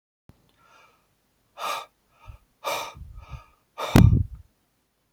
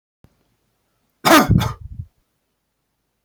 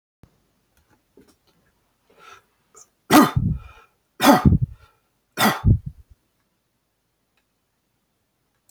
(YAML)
exhalation_length: 5.1 s
exhalation_amplitude: 32768
exhalation_signal_mean_std_ratio: 0.26
cough_length: 3.2 s
cough_amplitude: 32468
cough_signal_mean_std_ratio: 0.29
three_cough_length: 8.7 s
three_cough_amplitude: 32768
three_cough_signal_mean_std_ratio: 0.27
survey_phase: beta (2021-08-13 to 2022-03-07)
age: 65+
gender: Male
wearing_mask: 'No'
symptom_fatigue: true
smoker_status: Ex-smoker
respiratory_condition_asthma: false
respiratory_condition_other: false
recruitment_source: REACT
submission_delay: 2 days
covid_test_result: Negative
covid_test_method: RT-qPCR